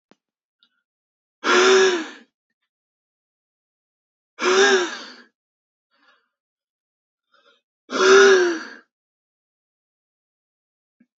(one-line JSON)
{"exhalation_length": "11.2 s", "exhalation_amplitude": 26018, "exhalation_signal_mean_std_ratio": 0.32, "survey_phase": "beta (2021-08-13 to 2022-03-07)", "age": "18-44", "gender": "Male", "wearing_mask": "No", "symptom_new_continuous_cough": true, "symptom_sore_throat": true, "symptom_other": true, "symptom_onset": "4 days", "smoker_status": "Never smoked", "respiratory_condition_asthma": false, "respiratory_condition_other": false, "recruitment_source": "Test and Trace", "submission_delay": "1 day", "covid_test_result": "Positive", "covid_test_method": "RT-qPCR", "covid_ct_value": 26.4, "covid_ct_gene": "ORF1ab gene"}